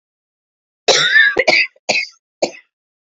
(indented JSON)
{
  "three_cough_length": "3.2 s",
  "three_cough_amplitude": 29916,
  "three_cough_signal_mean_std_ratio": 0.45,
  "survey_phase": "beta (2021-08-13 to 2022-03-07)",
  "age": "18-44",
  "gender": "Female",
  "wearing_mask": "No",
  "symptom_cough_any": true,
  "symptom_runny_or_blocked_nose": true,
  "symptom_sore_throat": true,
  "symptom_headache": true,
  "symptom_change_to_sense_of_smell_or_taste": true,
  "symptom_other": true,
  "symptom_onset": "4 days",
  "smoker_status": "Never smoked",
  "respiratory_condition_asthma": false,
  "respiratory_condition_other": false,
  "recruitment_source": "Test and Trace",
  "submission_delay": "2 days",
  "covid_test_result": "Positive",
  "covid_test_method": "RT-qPCR",
  "covid_ct_value": 19.9,
  "covid_ct_gene": "ORF1ab gene",
  "covid_ct_mean": 20.3,
  "covid_viral_load": "220000 copies/ml",
  "covid_viral_load_category": "Low viral load (10K-1M copies/ml)"
}